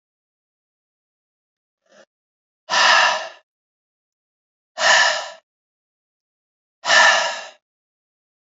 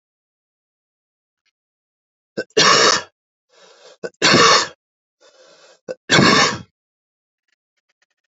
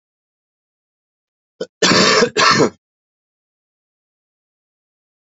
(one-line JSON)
{"exhalation_length": "8.5 s", "exhalation_amplitude": 29982, "exhalation_signal_mean_std_ratio": 0.33, "three_cough_length": "8.3 s", "three_cough_amplitude": 32304, "three_cough_signal_mean_std_ratio": 0.34, "cough_length": "5.2 s", "cough_amplitude": 29858, "cough_signal_mean_std_ratio": 0.32, "survey_phase": "beta (2021-08-13 to 2022-03-07)", "age": "18-44", "gender": "Male", "wearing_mask": "No", "symptom_cough_any": true, "symptom_fatigue": true, "symptom_headache": true, "symptom_other": true, "smoker_status": "Never smoked", "respiratory_condition_asthma": false, "respiratory_condition_other": false, "recruitment_source": "Test and Trace", "submission_delay": "1 day", "covid_test_result": "Positive", "covid_test_method": "RT-qPCR", "covid_ct_value": 24.0, "covid_ct_gene": "ORF1ab gene", "covid_ct_mean": 24.5, "covid_viral_load": "9200 copies/ml", "covid_viral_load_category": "Minimal viral load (< 10K copies/ml)"}